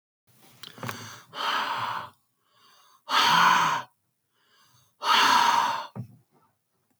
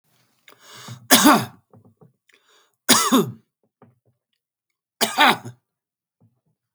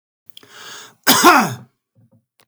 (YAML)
exhalation_length: 7.0 s
exhalation_amplitude: 15029
exhalation_signal_mean_std_ratio: 0.48
three_cough_length: 6.7 s
three_cough_amplitude: 32768
three_cough_signal_mean_std_ratio: 0.3
cough_length: 2.5 s
cough_amplitude: 32768
cough_signal_mean_std_ratio: 0.35
survey_phase: beta (2021-08-13 to 2022-03-07)
age: 45-64
gender: Male
wearing_mask: 'No'
symptom_none: true
smoker_status: Ex-smoker
respiratory_condition_asthma: false
respiratory_condition_other: false
recruitment_source: REACT
submission_delay: 1 day
covid_test_result: Negative
covid_test_method: RT-qPCR
influenza_a_test_result: Negative
influenza_b_test_result: Negative